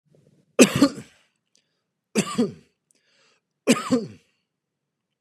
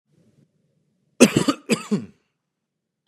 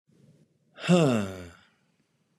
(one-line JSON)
{"three_cough_length": "5.2 s", "three_cough_amplitude": 32476, "three_cough_signal_mean_std_ratio": 0.28, "cough_length": "3.1 s", "cough_amplitude": 32768, "cough_signal_mean_std_ratio": 0.26, "exhalation_length": "2.4 s", "exhalation_amplitude": 13263, "exhalation_signal_mean_std_ratio": 0.36, "survey_phase": "beta (2021-08-13 to 2022-03-07)", "age": "18-44", "gender": "Male", "wearing_mask": "No", "symptom_none": true, "smoker_status": "Current smoker (1 to 10 cigarettes per day)", "respiratory_condition_asthma": false, "respiratory_condition_other": false, "recruitment_source": "Test and Trace", "submission_delay": "1 day", "covid_test_result": "Positive", "covid_test_method": "RT-qPCR", "covid_ct_value": 33.6, "covid_ct_gene": "S gene", "covid_ct_mean": 33.9, "covid_viral_load": "7.6 copies/ml", "covid_viral_load_category": "Minimal viral load (< 10K copies/ml)"}